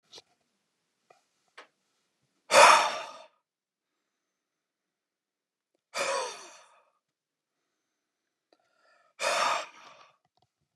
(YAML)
exhalation_length: 10.8 s
exhalation_amplitude: 22587
exhalation_signal_mean_std_ratio: 0.23
survey_phase: beta (2021-08-13 to 2022-03-07)
age: 45-64
gender: Male
wearing_mask: 'No'
symptom_none: true
smoker_status: Never smoked
respiratory_condition_asthma: false
respiratory_condition_other: false
recruitment_source: REACT
submission_delay: 2 days
covid_test_result: Negative
covid_test_method: RT-qPCR
influenza_a_test_result: Negative
influenza_b_test_result: Negative